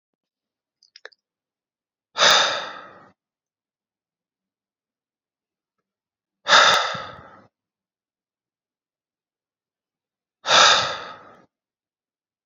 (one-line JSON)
{"exhalation_length": "12.5 s", "exhalation_amplitude": 30455, "exhalation_signal_mean_std_ratio": 0.26, "survey_phase": "beta (2021-08-13 to 2022-03-07)", "age": "18-44", "gender": "Male", "wearing_mask": "No", "symptom_none": true, "smoker_status": "Never smoked", "respiratory_condition_asthma": false, "respiratory_condition_other": false, "recruitment_source": "REACT", "submission_delay": "1 day", "covid_test_result": "Negative", "covid_test_method": "RT-qPCR"}